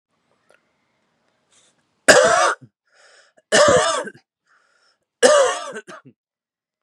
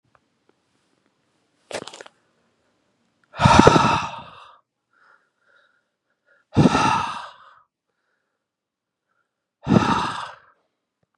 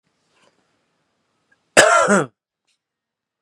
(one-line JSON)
{"three_cough_length": "6.8 s", "three_cough_amplitude": 32768, "three_cough_signal_mean_std_ratio": 0.36, "exhalation_length": "11.2 s", "exhalation_amplitude": 32768, "exhalation_signal_mean_std_ratio": 0.3, "cough_length": "3.4 s", "cough_amplitude": 32768, "cough_signal_mean_std_ratio": 0.29, "survey_phase": "beta (2021-08-13 to 2022-03-07)", "age": "18-44", "gender": "Male", "wearing_mask": "No", "symptom_cough_any": true, "symptom_runny_or_blocked_nose": true, "symptom_fatigue": true, "symptom_headache": true, "symptom_onset": "6 days", "smoker_status": "Never smoked", "respiratory_condition_asthma": false, "respiratory_condition_other": false, "recruitment_source": "Test and Trace", "submission_delay": "1 day", "covid_test_result": "Positive", "covid_test_method": "RT-qPCR", "covid_ct_value": 27.0, "covid_ct_gene": "N gene"}